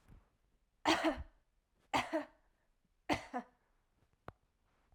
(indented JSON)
{
  "three_cough_length": "4.9 s",
  "three_cough_amplitude": 3726,
  "three_cough_signal_mean_std_ratio": 0.32,
  "survey_phase": "beta (2021-08-13 to 2022-03-07)",
  "age": "18-44",
  "gender": "Female",
  "wearing_mask": "No",
  "symptom_runny_or_blocked_nose": true,
  "symptom_onset": "3 days",
  "smoker_status": "Never smoked",
  "respiratory_condition_asthma": true,
  "respiratory_condition_other": false,
  "recruitment_source": "REACT",
  "submission_delay": "1 day",
  "covid_test_result": "Negative",
  "covid_test_method": "RT-qPCR",
  "influenza_a_test_result": "Negative",
  "influenza_b_test_result": "Negative"
}